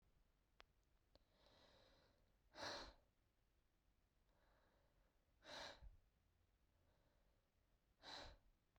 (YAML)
exhalation_length: 8.8 s
exhalation_amplitude: 333
exhalation_signal_mean_std_ratio: 0.41
survey_phase: beta (2021-08-13 to 2022-03-07)
age: 18-44
gender: Female
wearing_mask: 'No'
symptom_cough_any: true
symptom_runny_or_blocked_nose: true
symptom_sore_throat: true
symptom_headache: true
symptom_other: true
symptom_onset: 2 days
smoker_status: Never smoked
respiratory_condition_asthma: false
respiratory_condition_other: false
recruitment_source: Test and Trace
submission_delay: 1 day
covid_test_result: Positive
covid_test_method: RT-qPCR